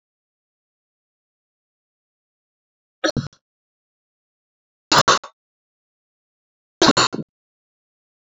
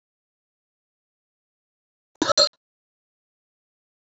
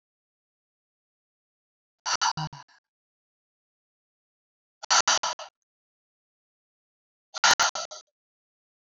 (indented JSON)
{
  "three_cough_length": "8.4 s",
  "three_cough_amplitude": 31797,
  "three_cough_signal_mean_std_ratio": 0.2,
  "cough_length": "4.1 s",
  "cough_amplitude": 20912,
  "cough_signal_mean_std_ratio": 0.16,
  "exhalation_length": "9.0 s",
  "exhalation_amplitude": 14958,
  "exhalation_signal_mean_std_ratio": 0.24,
  "survey_phase": "beta (2021-08-13 to 2022-03-07)",
  "age": "18-44",
  "gender": "Female",
  "wearing_mask": "No",
  "symptom_sore_throat": true,
  "symptom_abdominal_pain": true,
  "symptom_fatigue": true,
  "smoker_status": "Ex-smoker",
  "respiratory_condition_asthma": false,
  "respiratory_condition_other": false,
  "recruitment_source": "Test and Trace",
  "submission_delay": "2 days",
  "covid_test_result": "Positive",
  "covid_test_method": "RT-qPCR",
  "covid_ct_value": 19.6,
  "covid_ct_gene": "ORF1ab gene"
}